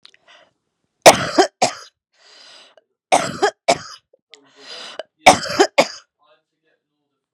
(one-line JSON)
{"three_cough_length": "7.3 s", "three_cough_amplitude": 32768, "three_cough_signal_mean_std_ratio": 0.28, "survey_phase": "beta (2021-08-13 to 2022-03-07)", "age": "45-64", "gender": "Female", "wearing_mask": "No", "symptom_cough_any": true, "symptom_fatigue": true, "symptom_headache": true, "symptom_onset": "2 days", "smoker_status": "Ex-smoker", "respiratory_condition_asthma": false, "respiratory_condition_other": false, "recruitment_source": "Test and Trace", "submission_delay": "2 days", "covid_test_result": "Negative", "covid_test_method": "RT-qPCR"}